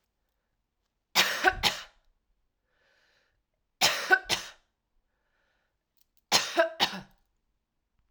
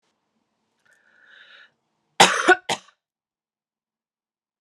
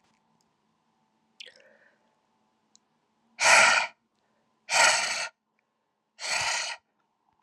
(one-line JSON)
{"three_cough_length": "8.1 s", "three_cough_amplitude": 14175, "three_cough_signal_mean_std_ratio": 0.3, "cough_length": "4.6 s", "cough_amplitude": 32709, "cough_signal_mean_std_ratio": 0.2, "exhalation_length": "7.4 s", "exhalation_amplitude": 20144, "exhalation_signal_mean_std_ratio": 0.33, "survey_phase": "alpha (2021-03-01 to 2021-08-12)", "age": "45-64", "gender": "Female", "wearing_mask": "No", "symptom_headache": true, "symptom_onset": "8 days", "smoker_status": "Never smoked", "respiratory_condition_asthma": false, "respiratory_condition_other": false, "recruitment_source": "Test and Trace", "submission_delay": "2 days", "covid_test_result": "Positive", "covid_test_method": "RT-qPCR"}